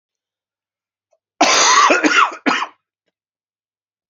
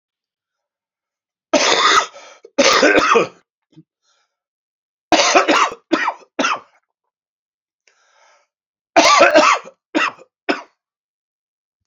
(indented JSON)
{
  "cough_length": "4.1 s",
  "cough_amplitude": 28964,
  "cough_signal_mean_std_ratio": 0.42,
  "three_cough_length": "11.9 s",
  "three_cough_amplitude": 32767,
  "three_cough_signal_mean_std_ratio": 0.41,
  "survey_phase": "beta (2021-08-13 to 2022-03-07)",
  "age": "65+",
  "gender": "Male",
  "wearing_mask": "No",
  "symptom_cough_any": true,
  "symptom_onset": "5 days",
  "smoker_status": "Never smoked",
  "respiratory_condition_asthma": true,
  "respiratory_condition_other": false,
  "recruitment_source": "Test and Trace",
  "submission_delay": "2 days",
  "covid_test_result": "Positive",
  "covid_test_method": "RT-qPCR",
  "covid_ct_value": 11.2,
  "covid_ct_gene": "ORF1ab gene",
  "covid_ct_mean": 11.6,
  "covid_viral_load": "150000000 copies/ml",
  "covid_viral_load_category": "High viral load (>1M copies/ml)"
}